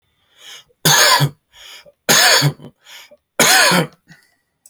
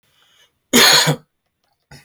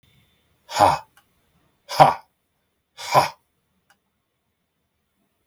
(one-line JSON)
{"three_cough_length": "4.7 s", "three_cough_amplitude": 32768, "three_cough_signal_mean_std_ratio": 0.48, "cough_length": "2.0 s", "cough_amplitude": 32768, "cough_signal_mean_std_ratio": 0.38, "exhalation_length": "5.5 s", "exhalation_amplitude": 29611, "exhalation_signal_mean_std_ratio": 0.24, "survey_phase": "alpha (2021-03-01 to 2021-08-12)", "age": "18-44", "gender": "Male", "wearing_mask": "No", "symptom_none": true, "smoker_status": "Current smoker (1 to 10 cigarettes per day)", "respiratory_condition_asthma": false, "respiratory_condition_other": false, "recruitment_source": "REACT", "submission_delay": "0 days", "covid_test_result": "Negative", "covid_test_method": "RT-qPCR"}